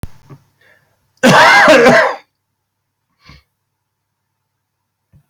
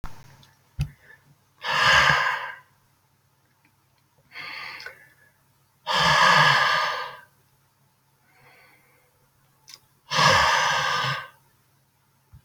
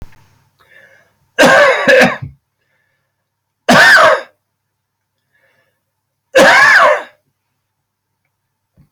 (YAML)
cough_length: 5.3 s
cough_amplitude: 32729
cough_signal_mean_std_ratio: 0.38
exhalation_length: 12.4 s
exhalation_amplitude: 22817
exhalation_signal_mean_std_ratio: 0.43
three_cough_length: 8.9 s
three_cough_amplitude: 32768
three_cough_signal_mean_std_ratio: 0.42
survey_phase: beta (2021-08-13 to 2022-03-07)
age: 65+
gender: Male
wearing_mask: 'No'
symptom_cough_any: true
symptom_runny_or_blocked_nose: true
symptom_sore_throat: true
symptom_abdominal_pain: true
symptom_fatigue: true
symptom_fever_high_temperature: true
symptom_headache: true
symptom_onset: 3 days
smoker_status: Never smoked
respiratory_condition_asthma: false
respiratory_condition_other: false
recruitment_source: Test and Trace
submission_delay: 1 day
covid_test_result: Positive
covid_test_method: RT-qPCR
covid_ct_value: 19.7
covid_ct_gene: ORF1ab gene